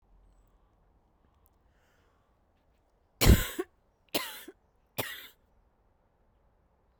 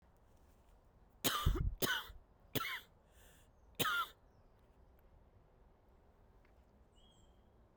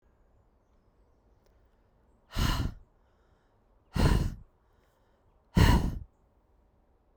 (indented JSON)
{
  "three_cough_length": "7.0 s",
  "three_cough_amplitude": 15754,
  "three_cough_signal_mean_std_ratio": 0.19,
  "cough_length": "7.8 s",
  "cough_amplitude": 3514,
  "cough_signal_mean_std_ratio": 0.36,
  "exhalation_length": "7.2 s",
  "exhalation_amplitude": 11485,
  "exhalation_signal_mean_std_ratio": 0.31,
  "survey_phase": "beta (2021-08-13 to 2022-03-07)",
  "age": "18-44",
  "gender": "Female",
  "wearing_mask": "Yes",
  "symptom_cough_any": true,
  "symptom_runny_or_blocked_nose": true,
  "symptom_abdominal_pain": true,
  "symptom_fatigue": true,
  "symptom_headache": true,
  "symptom_onset": "4 days",
  "smoker_status": "Never smoked",
  "respiratory_condition_asthma": true,
  "respiratory_condition_other": false,
  "recruitment_source": "Test and Trace",
  "submission_delay": "1 day",
  "covid_test_result": "Positive",
  "covid_test_method": "RT-qPCR",
  "covid_ct_value": 22.7,
  "covid_ct_gene": "N gene"
}